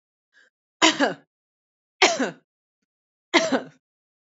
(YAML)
three_cough_length: 4.4 s
three_cough_amplitude: 26174
three_cough_signal_mean_std_ratio: 0.31
survey_phase: beta (2021-08-13 to 2022-03-07)
age: 18-44
gender: Female
wearing_mask: 'No'
symptom_cough_any: true
symptom_sore_throat: true
symptom_fever_high_temperature: true
smoker_status: Current smoker (1 to 10 cigarettes per day)
respiratory_condition_asthma: false
respiratory_condition_other: false
recruitment_source: Test and Trace
submission_delay: 1 day
covid_test_result: Positive
covid_test_method: LFT